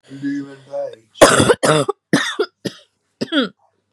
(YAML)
cough_length: 3.9 s
cough_amplitude: 32768
cough_signal_mean_std_ratio: 0.45
survey_phase: beta (2021-08-13 to 2022-03-07)
age: 18-44
gender: Female
wearing_mask: 'No'
symptom_cough_any: true
symptom_new_continuous_cough: true
symptom_runny_or_blocked_nose: true
symptom_shortness_of_breath: true
symptom_sore_throat: true
symptom_abdominal_pain: true
symptom_diarrhoea: true
symptom_fatigue: true
symptom_headache: true
symptom_change_to_sense_of_smell_or_taste: true
symptom_loss_of_taste: true
symptom_onset: 4 days
smoker_status: Never smoked
respiratory_condition_asthma: true
respiratory_condition_other: false
recruitment_source: Test and Trace
submission_delay: 1 day
covid_test_result: Positive
covid_test_method: RT-qPCR
covid_ct_value: 25.0
covid_ct_gene: ORF1ab gene